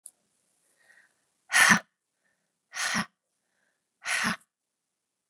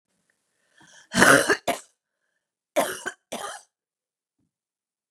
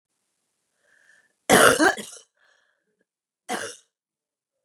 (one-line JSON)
{"exhalation_length": "5.3 s", "exhalation_amplitude": 16895, "exhalation_signal_mean_std_ratio": 0.27, "three_cough_length": "5.1 s", "three_cough_amplitude": 31878, "three_cough_signal_mean_std_ratio": 0.27, "cough_length": "4.6 s", "cough_amplitude": 31760, "cough_signal_mean_std_ratio": 0.26, "survey_phase": "beta (2021-08-13 to 2022-03-07)", "age": "45-64", "gender": "Female", "wearing_mask": "No", "symptom_cough_any": true, "symptom_runny_or_blocked_nose": true, "symptom_fatigue": true, "symptom_headache": true, "smoker_status": "Ex-smoker", "respiratory_condition_asthma": false, "respiratory_condition_other": false, "recruitment_source": "Test and Trace", "submission_delay": "2 days", "covid_test_result": "Positive", "covid_test_method": "LFT"}